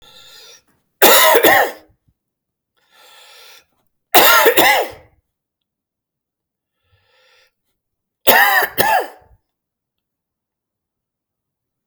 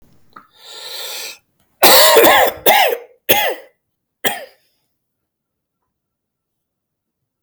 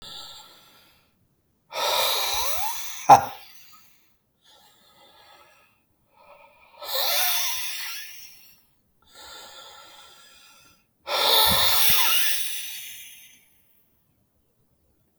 {"three_cough_length": "11.9 s", "three_cough_amplitude": 32768, "three_cough_signal_mean_std_ratio": 0.34, "cough_length": "7.4 s", "cough_amplitude": 32768, "cough_signal_mean_std_ratio": 0.37, "exhalation_length": "15.2 s", "exhalation_amplitude": 32767, "exhalation_signal_mean_std_ratio": 0.41, "survey_phase": "alpha (2021-03-01 to 2021-08-12)", "age": "45-64", "gender": "Male", "wearing_mask": "No", "symptom_cough_any": true, "symptom_shortness_of_breath": true, "symptom_fatigue": true, "symptom_fever_high_temperature": true, "smoker_status": "Never smoked", "respiratory_condition_asthma": false, "respiratory_condition_other": false, "recruitment_source": "Test and Trace", "submission_delay": "1 day", "covid_test_result": "Positive", "covid_test_method": "RT-qPCR", "covid_ct_value": 18.2, "covid_ct_gene": "ORF1ab gene"}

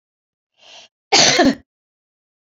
{"cough_length": "2.6 s", "cough_amplitude": 31677, "cough_signal_mean_std_ratio": 0.33, "survey_phase": "beta (2021-08-13 to 2022-03-07)", "age": "65+", "gender": "Female", "wearing_mask": "No", "symptom_none": true, "smoker_status": "Never smoked", "respiratory_condition_asthma": false, "respiratory_condition_other": false, "recruitment_source": "REACT", "submission_delay": "6 days", "covid_test_result": "Negative", "covid_test_method": "RT-qPCR"}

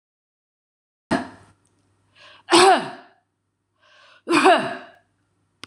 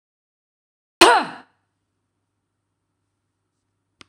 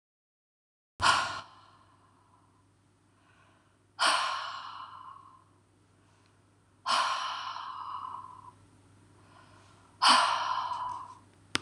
{"three_cough_length": "5.7 s", "three_cough_amplitude": 25900, "three_cough_signal_mean_std_ratio": 0.31, "cough_length": "4.1 s", "cough_amplitude": 26028, "cough_signal_mean_std_ratio": 0.18, "exhalation_length": "11.6 s", "exhalation_amplitude": 16219, "exhalation_signal_mean_std_ratio": 0.4, "survey_phase": "beta (2021-08-13 to 2022-03-07)", "age": "45-64", "gender": "Female", "wearing_mask": "No", "symptom_none": true, "smoker_status": "Never smoked", "respiratory_condition_asthma": false, "respiratory_condition_other": false, "recruitment_source": "REACT", "submission_delay": "3 days", "covid_test_result": "Negative", "covid_test_method": "RT-qPCR"}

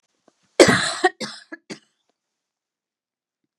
{"cough_length": "3.6 s", "cough_amplitude": 32768, "cough_signal_mean_std_ratio": 0.25, "survey_phase": "beta (2021-08-13 to 2022-03-07)", "age": "45-64", "gender": "Female", "wearing_mask": "No", "symptom_new_continuous_cough": true, "symptom_runny_or_blocked_nose": true, "symptom_shortness_of_breath": true, "symptom_diarrhoea": true, "symptom_fatigue": true, "symptom_onset": "2 days", "smoker_status": "Never smoked", "respiratory_condition_asthma": true, "respiratory_condition_other": false, "recruitment_source": "Test and Trace", "submission_delay": "1 day", "covid_test_result": "Positive", "covid_test_method": "RT-qPCR", "covid_ct_value": 24.4, "covid_ct_gene": "N gene"}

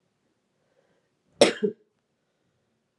{"cough_length": "3.0 s", "cough_amplitude": 22744, "cough_signal_mean_std_ratio": 0.18, "survey_phase": "beta (2021-08-13 to 2022-03-07)", "age": "18-44", "gender": "Female", "wearing_mask": "No", "symptom_cough_any": true, "symptom_runny_or_blocked_nose": true, "symptom_shortness_of_breath": true, "symptom_sore_throat": true, "symptom_diarrhoea": true, "symptom_fatigue": true, "symptom_fever_high_temperature": true, "symptom_headache": true, "symptom_loss_of_taste": true, "symptom_onset": "5 days", "smoker_status": "Ex-smoker", "respiratory_condition_asthma": false, "respiratory_condition_other": false, "recruitment_source": "Test and Trace", "submission_delay": "2 days", "covid_test_result": "Positive", "covid_test_method": "RT-qPCR", "covid_ct_value": 15.2, "covid_ct_gene": "ORF1ab gene", "covid_ct_mean": 15.7, "covid_viral_load": "7000000 copies/ml", "covid_viral_load_category": "High viral load (>1M copies/ml)"}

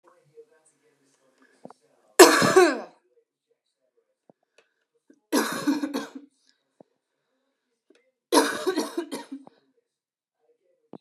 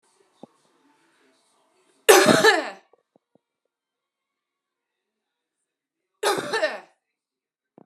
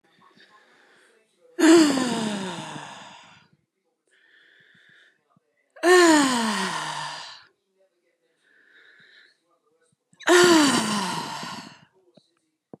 {"three_cough_length": "11.0 s", "three_cough_amplitude": 32767, "three_cough_signal_mean_std_ratio": 0.26, "cough_length": "7.9 s", "cough_amplitude": 32767, "cough_signal_mean_std_ratio": 0.25, "exhalation_length": "12.8 s", "exhalation_amplitude": 21168, "exhalation_signal_mean_std_ratio": 0.39, "survey_phase": "beta (2021-08-13 to 2022-03-07)", "age": "18-44", "gender": "Female", "wearing_mask": "No", "symptom_cough_any": true, "symptom_runny_or_blocked_nose": true, "symptom_sore_throat": true, "symptom_abdominal_pain": true, "symptom_fatigue": true, "symptom_fever_high_temperature": true, "symptom_headache": true, "symptom_change_to_sense_of_smell_or_taste": true, "symptom_other": true, "symptom_onset": "3 days", "smoker_status": "Ex-smoker", "respiratory_condition_asthma": false, "respiratory_condition_other": false, "recruitment_source": "Test and Trace", "submission_delay": "1 day", "covid_test_result": "Positive", "covid_test_method": "RT-qPCR", "covid_ct_value": 23.5, "covid_ct_gene": "ORF1ab gene", "covid_ct_mean": 23.6, "covid_viral_load": "18000 copies/ml", "covid_viral_load_category": "Low viral load (10K-1M copies/ml)"}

